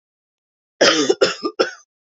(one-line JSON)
{"three_cough_length": "2.0 s", "three_cough_amplitude": 32768, "three_cough_signal_mean_std_ratio": 0.42, "survey_phase": "beta (2021-08-13 to 2022-03-07)", "age": "18-44", "gender": "Female", "wearing_mask": "No", "symptom_cough_any": true, "symptom_runny_or_blocked_nose": true, "symptom_sore_throat": true, "symptom_fatigue": true, "symptom_fever_high_temperature": true, "symptom_headache": true, "symptom_change_to_sense_of_smell_or_taste": true, "symptom_loss_of_taste": true, "symptom_other": true, "symptom_onset": "6 days", "smoker_status": "Never smoked", "respiratory_condition_asthma": false, "respiratory_condition_other": false, "recruitment_source": "Test and Trace", "submission_delay": "4 days", "covid_test_result": "Positive", "covid_test_method": "RT-qPCR", "covid_ct_value": 18.6, "covid_ct_gene": "N gene"}